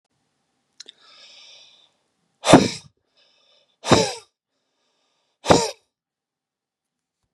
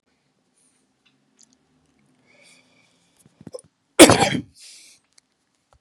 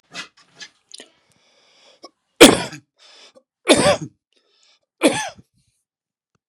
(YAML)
exhalation_length: 7.3 s
exhalation_amplitude: 32768
exhalation_signal_mean_std_ratio: 0.22
cough_length: 5.8 s
cough_amplitude: 32768
cough_signal_mean_std_ratio: 0.17
three_cough_length: 6.5 s
three_cough_amplitude: 32768
three_cough_signal_mean_std_ratio: 0.24
survey_phase: beta (2021-08-13 to 2022-03-07)
age: 45-64
gender: Male
wearing_mask: 'No'
symptom_runny_or_blocked_nose: true
smoker_status: Ex-smoker
respiratory_condition_asthma: false
respiratory_condition_other: false
recruitment_source: REACT
submission_delay: 2 days
covid_test_result: Negative
covid_test_method: RT-qPCR
influenza_a_test_result: Negative
influenza_b_test_result: Negative